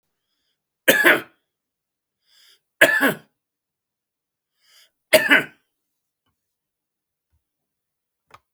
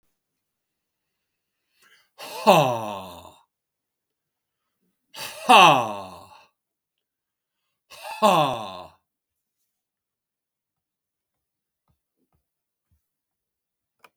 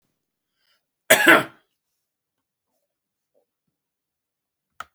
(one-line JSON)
{"three_cough_length": "8.5 s", "three_cough_amplitude": 32768, "three_cough_signal_mean_std_ratio": 0.24, "exhalation_length": "14.2 s", "exhalation_amplitude": 32766, "exhalation_signal_mean_std_ratio": 0.23, "cough_length": "4.9 s", "cough_amplitude": 32766, "cough_signal_mean_std_ratio": 0.19, "survey_phase": "beta (2021-08-13 to 2022-03-07)", "age": "18-44", "gender": "Male", "wearing_mask": "No", "symptom_none": true, "smoker_status": "Ex-smoker", "respiratory_condition_asthma": false, "respiratory_condition_other": false, "recruitment_source": "REACT", "submission_delay": "2 days", "covid_test_result": "Negative", "covid_test_method": "RT-qPCR", "influenza_a_test_result": "Negative", "influenza_b_test_result": "Negative"}